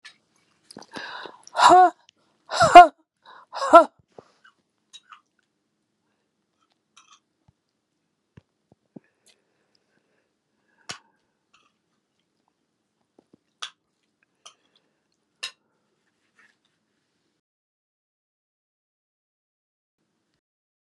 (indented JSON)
{
  "exhalation_length": "20.9 s",
  "exhalation_amplitude": 32768,
  "exhalation_signal_mean_std_ratio": 0.15,
  "survey_phase": "beta (2021-08-13 to 2022-03-07)",
  "age": "65+",
  "gender": "Female",
  "wearing_mask": "No",
  "symptom_cough_any": true,
  "symptom_runny_or_blocked_nose": true,
  "symptom_shortness_of_breath": true,
  "symptom_sore_throat": true,
  "symptom_diarrhoea": true,
  "smoker_status": "Ex-smoker",
  "respiratory_condition_asthma": true,
  "respiratory_condition_other": false,
  "recruitment_source": "Test and Trace",
  "submission_delay": "3 days",
  "covid_test_result": "Positive",
  "covid_test_method": "RT-qPCR",
  "covid_ct_value": 17.2,
  "covid_ct_gene": "N gene",
  "covid_ct_mean": 17.4,
  "covid_viral_load": "2000000 copies/ml",
  "covid_viral_load_category": "High viral load (>1M copies/ml)"
}